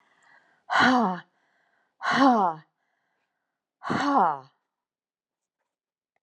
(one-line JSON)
{"exhalation_length": "6.2 s", "exhalation_amplitude": 17286, "exhalation_signal_mean_std_ratio": 0.38, "survey_phase": "alpha (2021-03-01 to 2021-08-12)", "age": "45-64", "gender": "Female", "wearing_mask": "No", "symptom_none": true, "smoker_status": "Never smoked", "respiratory_condition_asthma": false, "respiratory_condition_other": false, "recruitment_source": "REACT", "submission_delay": "2 days", "covid_test_result": "Negative", "covid_test_method": "RT-qPCR"}